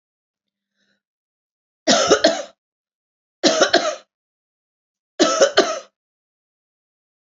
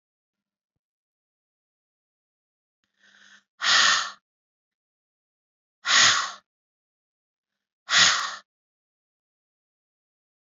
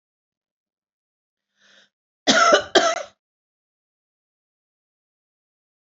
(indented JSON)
{
  "three_cough_length": "7.3 s",
  "three_cough_amplitude": 30788,
  "three_cough_signal_mean_std_ratio": 0.34,
  "exhalation_length": "10.5 s",
  "exhalation_amplitude": 20719,
  "exhalation_signal_mean_std_ratio": 0.27,
  "cough_length": "6.0 s",
  "cough_amplitude": 28186,
  "cough_signal_mean_std_ratio": 0.24,
  "survey_phase": "beta (2021-08-13 to 2022-03-07)",
  "age": "45-64",
  "gender": "Female",
  "wearing_mask": "No",
  "symptom_shortness_of_breath": true,
  "symptom_fatigue": true,
  "smoker_status": "Never smoked",
  "respiratory_condition_asthma": false,
  "respiratory_condition_other": false,
  "recruitment_source": "REACT",
  "submission_delay": "15 days",
  "covid_test_result": "Negative",
  "covid_test_method": "RT-qPCR",
  "influenza_a_test_result": "Negative",
  "influenza_b_test_result": "Negative"
}